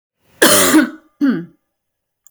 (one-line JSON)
{"cough_length": "2.3 s", "cough_amplitude": 32768, "cough_signal_mean_std_ratio": 0.47, "survey_phase": "beta (2021-08-13 to 2022-03-07)", "age": "45-64", "gender": "Female", "wearing_mask": "No", "symptom_none": true, "smoker_status": "Never smoked", "respiratory_condition_asthma": false, "respiratory_condition_other": false, "recruitment_source": "REACT", "submission_delay": "5 days", "covid_test_result": "Negative", "covid_test_method": "RT-qPCR", "influenza_a_test_result": "Negative", "influenza_b_test_result": "Negative"}